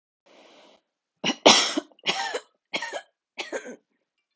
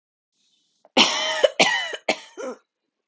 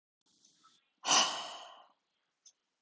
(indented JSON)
{
  "three_cough_length": "4.4 s",
  "three_cough_amplitude": 30674,
  "three_cough_signal_mean_std_ratio": 0.31,
  "cough_length": "3.1 s",
  "cough_amplitude": 27023,
  "cough_signal_mean_std_ratio": 0.41,
  "exhalation_length": "2.8 s",
  "exhalation_amplitude": 6370,
  "exhalation_signal_mean_std_ratio": 0.29,
  "survey_phase": "alpha (2021-03-01 to 2021-08-12)",
  "age": "18-44",
  "gender": "Female",
  "wearing_mask": "No",
  "symptom_none": true,
  "smoker_status": "Never smoked",
  "respiratory_condition_asthma": true,
  "respiratory_condition_other": false,
  "recruitment_source": "REACT",
  "submission_delay": "1 day",
  "covid_test_result": "Negative",
  "covid_test_method": "RT-qPCR"
}